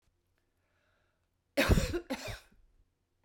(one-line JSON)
{"cough_length": "3.2 s", "cough_amplitude": 8221, "cough_signal_mean_std_ratio": 0.31, "survey_phase": "beta (2021-08-13 to 2022-03-07)", "age": "45-64", "gender": "Female", "wearing_mask": "No", "symptom_none": true, "smoker_status": "Ex-smoker", "respiratory_condition_asthma": false, "respiratory_condition_other": false, "recruitment_source": "REACT", "submission_delay": "8 days", "covid_test_result": "Negative", "covid_test_method": "RT-qPCR"}